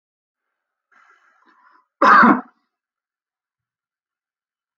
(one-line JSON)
{"cough_length": "4.8 s", "cough_amplitude": 28204, "cough_signal_mean_std_ratio": 0.23, "survey_phase": "alpha (2021-03-01 to 2021-08-12)", "age": "45-64", "gender": "Male", "wearing_mask": "No", "symptom_none": true, "smoker_status": "Never smoked", "respiratory_condition_asthma": false, "respiratory_condition_other": false, "recruitment_source": "REACT", "submission_delay": "2 days", "covid_test_result": "Negative", "covid_test_method": "RT-qPCR"}